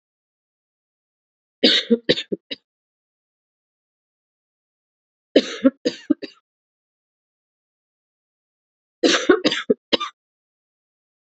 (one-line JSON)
{"three_cough_length": "11.3 s", "three_cough_amplitude": 30117, "three_cough_signal_mean_std_ratio": 0.24, "survey_phase": "beta (2021-08-13 to 2022-03-07)", "age": "18-44", "gender": "Female", "wearing_mask": "No", "symptom_cough_any": true, "symptom_runny_or_blocked_nose": true, "symptom_sore_throat": true, "symptom_fatigue": true, "symptom_headache": true, "symptom_change_to_sense_of_smell_or_taste": true, "symptom_onset": "4 days", "smoker_status": "Current smoker (e-cigarettes or vapes only)", "respiratory_condition_asthma": false, "respiratory_condition_other": false, "recruitment_source": "Test and Trace", "submission_delay": "2 days", "covid_test_result": "Positive", "covid_test_method": "RT-qPCR", "covid_ct_value": 18.3, "covid_ct_gene": "ORF1ab gene", "covid_ct_mean": 18.5, "covid_viral_load": "870000 copies/ml", "covid_viral_load_category": "Low viral load (10K-1M copies/ml)"}